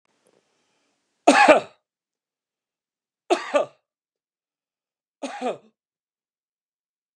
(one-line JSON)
{"three_cough_length": "7.2 s", "three_cough_amplitude": 32767, "three_cough_signal_mean_std_ratio": 0.22, "survey_phase": "beta (2021-08-13 to 2022-03-07)", "age": "45-64", "gender": "Male", "wearing_mask": "No", "symptom_none": true, "smoker_status": "Never smoked", "respiratory_condition_asthma": false, "respiratory_condition_other": false, "recruitment_source": "REACT", "submission_delay": "3 days", "covid_test_result": "Negative", "covid_test_method": "RT-qPCR", "influenza_a_test_result": "Negative", "influenza_b_test_result": "Negative"}